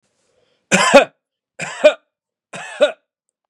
{"three_cough_length": "3.5 s", "three_cough_amplitude": 32768, "three_cough_signal_mean_std_ratio": 0.31, "survey_phase": "beta (2021-08-13 to 2022-03-07)", "age": "18-44", "gender": "Male", "wearing_mask": "No", "symptom_none": true, "smoker_status": "Ex-smoker", "respiratory_condition_asthma": false, "respiratory_condition_other": false, "recruitment_source": "REACT", "submission_delay": "4 days", "covid_test_result": "Negative", "covid_test_method": "RT-qPCR", "influenza_a_test_result": "Negative", "influenza_b_test_result": "Negative"}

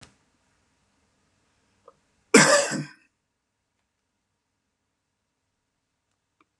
{"cough_length": "6.6 s", "cough_amplitude": 28595, "cough_signal_mean_std_ratio": 0.19, "survey_phase": "beta (2021-08-13 to 2022-03-07)", "age": "65+", "gender": "Male", "wearing_mask": "No", "symptom_none": true, "smoker_status": "Ex-smoker", "respiratory_condition_asthma": false, "respiratory_condition_other": false, "recruitment_source": "REACT", "submission_delay": "2 days", "covid_test_result": "Negative", "covid_test_method": "RT-qPCR", "influenza_a_test_result": "Negative", "influenza_b_test_result": "Negative"}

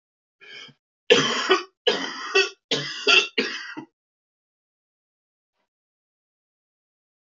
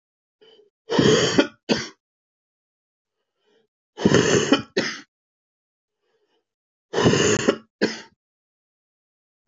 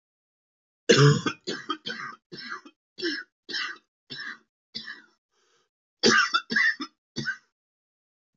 {"three_cough_length": "7.3 s", "three_cough_amplitude": 26341, "three_cough_signal_mean_std_ratio": 0.34, "exhalation_length": "9.5 s", "exhalation_amplitude": 23655, "exhalation_signal_mean_std_ratio": 0.37, "cough_length": "8.4 s", "cough_amplitude": 19844, "cough_signal_mean_std_ratio": 0.36, "survey_phase": "beta (2021-08-13 to 2022-03-07)", "age": "45-64", "gender": "Male", "wearing_mask": "No", "symptom_cough_any": true, "symptom_new_continuous_cough": true, "symptom_runny_or_blocked_nose": true, "symptom_shortness_of_breath": true, "symptom_sore_throat": true, "symptom_diarrhoea": true, "symptom_fatigue": true, "symptom_fever_high_temperature": true, "symptom_headache": true, "symptom_change_to_sense_of_smell_or_taste": true, "symptom_onset": "3 days", "smoker_status": "Never smoked", "respiratory_condition_asthma": false, "respiratory_condition_other": false, "recruitment_source": "Test and Trace", "submission_delay": "2 days", "covid_test_result": "Positive", "covid_test_method": "RT-qPCR"}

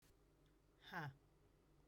{"exhalation_length": "1.9 s", "exhalation_amplitude": 438, "exhalation_signal_mean_std_ratio": 0.43, "survey_phase": "beta (2021-08-13 to 2022-03-07)", "age": "45-64", "gender": "Female", "wearing_mask": "No", "symptom_none": true, "smoker_status": "Never smoked", "respiratory_condition_asthma": false, "respiratory_condition_other": false, "recruitment_source": "REACT", "submission_delay": "3 days", "covid_test_result": "Negative", "covid_test_method": "RT-qPCR", "influenza_a_test_result": "Negative", "influenza_b_test_result": "Negative"}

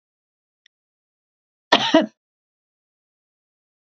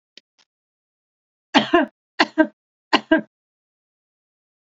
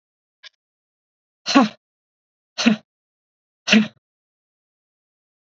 {"cough_length": "3.9 s", "cough_amplitude": 27947, "cough_signal_mean_std_ratio": 0.19, "three_cough_length": "4.7 s", "three_cough_amplitude": 29637, "three_cough_signal_mean_std_ratio": 0.25, "exhalation_length": "5.5 s", "exhalation_amplitude": 30833, "exhalation_signal_mean_std_ratio": 0.24, "survey_phase": "beta (2021-08-13 to 2022-03-07)", "age": "45-64", "gender": "Female", "wearing_mask": "No", "symptom_none": true, "smoker_status": "Ex-smoker", "respiratory_condition_asthma": false, "respiratory_condition_other": false, "recruitment_source": "REACT", "submission_delay": "1 day", "covid_test_result": "Negative", "covid_test_method": "RT-qPCR", "influenza_a_test_result": "Unknown/Void", "influenza_b_test_result": "Unknown/Void"}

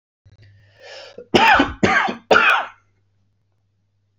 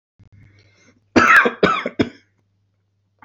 {"three_cough_length": "4.2 s", "three_cough_amplitude": 32767, "three_cough_signal_mean_std_ratio": 0.41, "cough_length": "3.2 s", "cough_amplitude": 28135, "cough_signal_mean_std_ratio": 0.35, "survey_phase": "beta (2021-08-13 to 2022-03-07)", "age": "18-44", "gender": "Male", "wearing_mask": "No", "symptom_none": true, "smoker_status": "Ex-smoker", "respiratory_condition_asthma": false, "respiratory_condition_other": false, "recruitment_source": "REACT", "submission_delay": "1 day", "covid_test_result": "Negative", "covid_test_method": "RT-qPCR", "influenza_a_test_result": "Unknown/Void", "influenza_b_test_result": "Unknown/Void"}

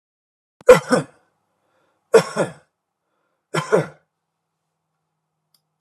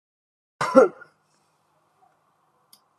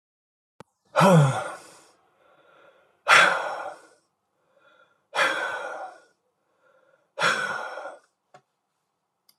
{"three_cough_length": "5.8 s", "three_cough_amplitude": 32768, "three_cough_signal_mean_std_ratio": 0.23, "cough_length": "3.0 s", "cough_amplitude": 29664, "cough_signal_mean_std_ratio": 0.2, "exhalation_length": "9.4 s", "exhalation_amplitude": 23428, "exhalation_signal_mean_std_ratio": 0.35, "survey_phase": "alpha (2021-03-01 to 2021-08-12)", "age": "65+", "gender": "Male", "wearing_mask": "No", "symptom_none": true, "smoker_status": "Ex-smoker", "respiratory_condition_asthma": false, "respiratory_condition_other": false, "recruitment_source": "REACT", "submission_delay": "1 day", "covid_test_result": "Negative", "covid_test_method": "RT-qPCR"}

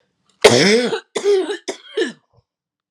{"three_cough_length": "2.9 s", "three_cough_amplitude": 32768, "three_cough_signal_mean_std_ratio": 0.48, "survey_phase": "alpha (2021-03-01 to 2021-08-12)", "age": "45-64", "gender": "Female", "wearing_mask": "No", "symptom_cough_any": true, "symptom_shortness_of_breath": true, "symptom_fatigue": true, "symptom_headache": true, "symptom_onset": "4 days", "smoker_status": "Prefer not to say", "respiratory_condition_asthma": false, "respiratory_condition_other": false, "recruitment_source": "Test and Trace", "submission_delay": "2 days", "covid_test_result": "Positive", "covid_test_method": "RT-qPCR", "covid_ct_value": 15.5, "covid_ct_gene": "ORF1ab gene", "covid_ct_mean": 15.5, "covid_viral_load": "8200000 copies/ml", "covid_viral_load_category": "High viral load (>1M copies/ml)"}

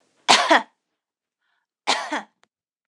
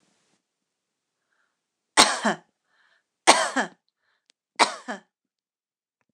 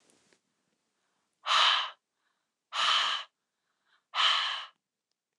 {"cough_length": "2.9 s", "cough_amplitude": 29204, "cough_signal_mean_std_ratio": 0.31, "three_cough_length": "6.1 s", "three_cough_amplitude": 29204, "three_cough_signal_mean_std_ratio": 0.24, "exhalation_length": "5.4 s", "exhalation_amplitude": 9262, "exhalation_signal_mean_std_ratio": 0.4, "survey_phase": "beta (2021-08-13 to 2022-03-07)", "age": "18-44", "gender": "Female", "wearing_mask": "No", "symptom_none": true, "smoker_status": "Never smoked", "respiratory_condition_asthma": true, "respiratory_condition_other": false, "recruitment_source": "REACT", "submission_delay": "2 days", "covid_test_result": "Negative", "covid_test_method": "RT-qPCR"}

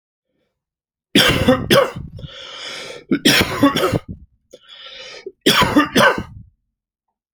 {"three_cough_length": "7.3 s", "three_cough_amplitude": 31426, "three_cough_signal_mean_std_ratio": 0.47, "survey_phase": "alpha (2021-03-01 to 2021-08-12)", "age": "45-64", "gender": "Male", "wearing_mask": "No", "symptom_none": true, "smoker_status": "Ex-smoker", "respiratory_condition_asthma": false, "respiratory_condition_other": false, "recruitment_source": "REACT", "submission_delay": "1 day", "covid_test_result": "Negative", "covid_test_method": "RT-qPCR"}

